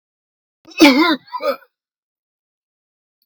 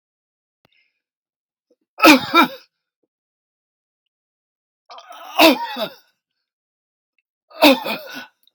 {"cough_length": "3.3 s", "cough_amplitude": 32768, "cough_signal_mean_std_ratio": 0.31, "three_cough_length": "8.5 s", "three_cough_amplitude": 32768, "three_cough_signal_mean_std_ratio": 0.26, "survey_phase": "beta (2021-08-13 to 2022-03-07)", "age": "65+", "gender": "Male", "wearing_mask": "No", "symptom_none": true, "smoker_status": "Never smoked", "respiratory_condition_asthma": false, "respiratory_condition_other": false, "recruitment_source": "REACT", "submission_delay": "1 day", "covid_test_result": "Negative", "covid_test_method": "RT-qPCR"}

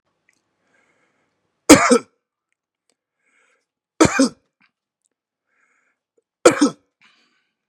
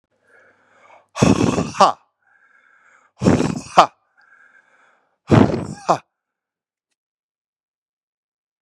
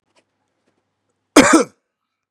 {"three_cough_length": "7.7 s", "three_cough_amplitude": 32768, "three_cough_signal_mean_std_ratio": 0.22, "exhalation_length": "8.6 s", "exhalation_amplitude": 32768, "exhalation_signal_mean_std_ratio": 0.29, "cough_length": "2.3 s", "cough_amplitude": 32768, "cough_signal_mean_std_ratio": 0.26, "survey_phase": "beta (2021-08-13 to 2022-03-07)", "age": "18-44", "gender": "Male", "wearing_mask": "No", "symptom_abdominal_pain": true, "symptom_headache": true, "symptom_other": true, "smoker_status": "Never smoked", "respiratory_condition_asthma": false, "respiratory_condition_other": false, "recruitment_source": "Test and Trace", "submission_delay": "2 days", "covid_test_result": "Positive", "covid_test_method": "RT-qPCR", "covid_ct_value": 28.4, "covid_ct_gene": "ORF1ab gene"}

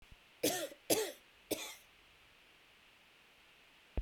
{"three_cough_length": "4.0 s", "three_cough_amplitude": 6193, "three_cough_signal_mean_std_ratio": 0.36, "survey_phase": "beta (2021-08-13 to 2022-03-07)", "age": "45-64", "gender": "Female", "wearing_mask": "No", "symptom_cough_any": true, "symptom_runny_or_blocked_nose": true, "symptom_fatigue": true, "symptom_onset": "3 days", "smoker_status": "Never smoked", "respiratory_condition_asthma": false, "respiratory_condition_other": false, "recruitment_source": "Test and Trace", "submission_delay": "2 days", "covid_test_result": "Positive", "covid_test_method": "RT-qPCR", "covid_ct_value": 18.2, "covid_ct_gene": "ORF1ab gene", "covid_ct_mean": 19.5, "covid_viral_load": "410000 copies/ml", "covid_viral_load_category": "Low viral load (10K-1M copies/ml)"}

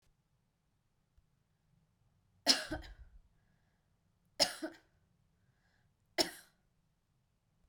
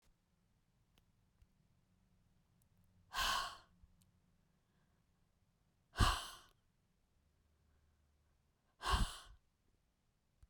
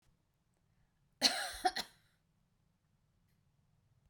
{"three_cough_length": "7.7 s", "three_cough_amplitude": 9035, "three_cough_signal_mean_std_ratio": 0.2, "exhalation_length": "10.5 s", "exhalation_amplitude": 3762, "exhalation_signal_mean_std_ratio": 0.24, "cough_length": "4.1 s", "cough_amplitude": 7063, "cough_signal_mean_std_ratio": 0.24, "survey_phase": "beta (2021-08-13 to 2022-03-07)", "age": "65+", "gender": "Female", "wearing_mask": "No", "symptom_none": true, "smoker_status": "Never smoked", "respiratory_condition_asthma": false, "respiratory_condition_other": false, "recruitment_source": "REACT", "submission_delay": "1 day", "covid_test_result": "Negative", "covid_test_method": "RT-qPCR", "influenza_a_test_result": "Negative", "influenza_b_test_result": "Negative"}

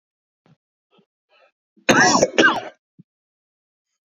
{"cough_length": "4.1 s", "cough_amplitude": 28321, "cough_signal_mean_std_ratio": 0.31, "survey_phase": "beta (2021-08-13 to 2022-03-07)", "age": "45-64", "gender": "Male", "wearing_mask": "No", "symptom_cough_any": true, "symptom_new_continuous_cough": true, "symptom_runny_or_blocked_nose": true, "symptom_fatigue": true, "symptom_headache": true, "smoker_status": "Ex-smoker", "respiratory_condition_asthma": false, "respiratory_condition_other": false, "recruitment_source": "Test and Trace", "submission_delay": "2 days", "covid_test_result": "Positive", "covid_test_method": "RT-qPCR", "covid_ct_value": 17.4, "covid_ct_gene": "ORF1ab gene", "covid_ct_mean": 18.1, "covid_viral_load": "1200000 copies/ml", "covid_viral_load_category": "High viral load (>1M copies/ml)"}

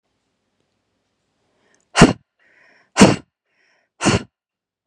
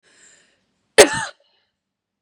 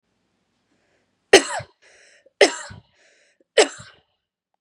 {"exhalation_length": "4.9 s", "exhalation_amplitude": 32768, "exhalation_signal_mean_std_ratio": 0.23, "cough_length": "2.2 s", "cough_amplitude": 32768, "cough_signal_mean_std_ratio": 0.2, "three_cough_length": "4.6 s", "three_cough_amplitude": 32768, "three_cough_signal_mean_std_ratio": 0.21, "survey_phase": "beta (2021-08-13 to 2022-03-07)", "age": "18-44", "gender": "Female", "wearing_mask": "No", "symptom_sore_throat": true, "smoker_status": "Never smoked", "respiratory_condition_asthma": true, "respiratory_condition_other": false, "recruitment_source": "REACT", "submission_delay": "3 days", "covid_test_result": "Negative", "covid_test_method": "RT-qPCR", "influenza_a_test_result": "Negative", "influenza_b_test_result": "Negative"}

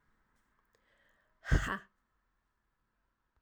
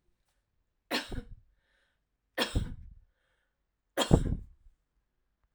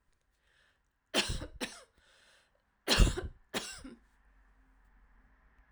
{"exhalation_length": "3.4 s", "exhalation_amplitude": 5887, "exhalation_signal_mean_std_ratio": 0.21, "three_cough_length": "5.5 s", "three_cough_amplitude": 14966, "three_cough_signal_mean_std_ratio": 0.28, "cough_length": "5.7 s", "cough_amplitude": 9588, "cough_signal_mean_std_ratio": 0.28, "survey_phase": "alpha (2021-03-01 to 2021-08-12)", "age": "45-64", "gender": "Female", "wearing_mask": "No", "symptom_none": true, "smoker_status": "Never smoked", "respiratory_condition_asthma": true, "respiratory_condition_other": false, "recruitment_source": "REACT", "submission_delay": "1 day", "covid_test_result": "Negative", "covid_test_method": "RT-qPCR"}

